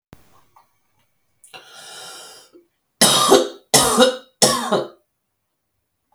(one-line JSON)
{"three_cough_length": "6.1 s", "three_cough_amplitude": 32768, "three_cough_signal_mean_std_ratio": 0.37, "survey_phase": "beta (2021-08-13 to 2022-03-07)", "age": "45-64", "gender": "Female", "wearing_mask": "No", "symptom_cough_any": true, "symptom_new_continuous_cough": true, "symptom_runny_or_blocked_nose": true, "symptom_sore_throat": true, "symptom_fatigue": true, "symptom_headache": true, "smoker_status": "Ex-smoker", "respiratory_condition_asthma": false, "respiratory_condition_other": false, "recruitment_source": "Test and Trace", "submission_delay": "1 day", "covid_test_result": "Positive", "covid_test_method": "LFT"}